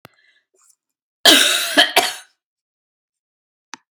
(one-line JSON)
{"cough_length": "3.9 s", "cough_amplitude": 32768, "cough_signal_mean_std_ratio": 0.33, "survey_phase": "beta (2021-08-13 to 2022-03-07)", "age": "45-64", "gender": "Female", "wearing_mask": "Yes", "symptom_cough_any": true, "symptom_sore_throat": true, "symptom_fatigue": true, "symptom_headache": true, "symptom_onset": "2 days", "smoker_status": "Never smoked", "respiratory_condition_asthma": false, "respiratory_condition_other": false, "recruitment_source": "Test and Trace", "submission_delay": "1 day", "covid_test_result": "Positive", "covid_test_method": "RT-qPCR", "covid_ct_value": 20.9, "covid_ct_gene": "ORF1ab gene"}